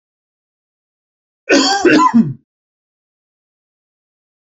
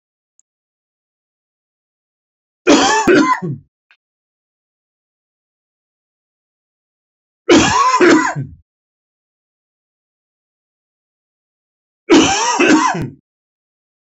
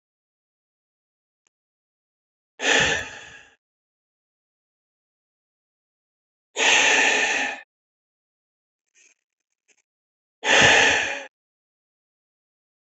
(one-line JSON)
{"cough_length": "4.4 s", "cough_amplitude": 28396, "cough_signal_mean_std_ratio": 0.35, "three_cough_length": "14.1 s", "three_cough_amplitude": 30969, "three_cough_signal_mean_std_ratio": 0.35, "exhalation_length": "13.0 s", "exhalation_amplitude": 22900, "exhalation_signal_mean_std_ratio": 0.32, "survey_phase": "beta (2021-08-13 to 2022-03-07)", "age": "45-64", "gender": "Male", "wearing_mask": "No", "symptom_none": true, "smoker_status": "Never smoked", "respiratory_condition_asthma": false, "respiratory_condition_other": false, "recruitment_source": "REACT", "submission_delay": "3 days", "covid_test_result": "Negative", "covid_test_method": "RT-qPCR", "influenza_a_test_result": "Negative", "influenza_b_test_result": "Negative"}